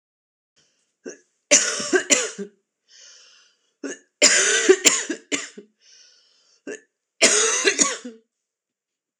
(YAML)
three_cough_length: 9.2 s
three_cough_amplitude: 26028
three_cough_signal_mean_std_ratio: 0.39
survey_phase: alpha (2021-03-01 to 2021-08-12)
age: 18-44
gender: Female
wearing_mask: 'No'
symptom_cough_any: true
symptom_fatigue: true
symptom_headache: true
symptom_change_to_sense_of_smell_or_taste: true
symptom_loss_of_taste: true
symptom_onset: 8 days
smoker_status: Never smoked
respiratory_condition_asthma: false
respiratory_condition_other: false
recruitment_source: REACT
submission_delay: 1 day
covid_test_result: Positive
covid_test_method: RT-qPCR
covid_ct_value: 27.0
covid_ct_gene: N gene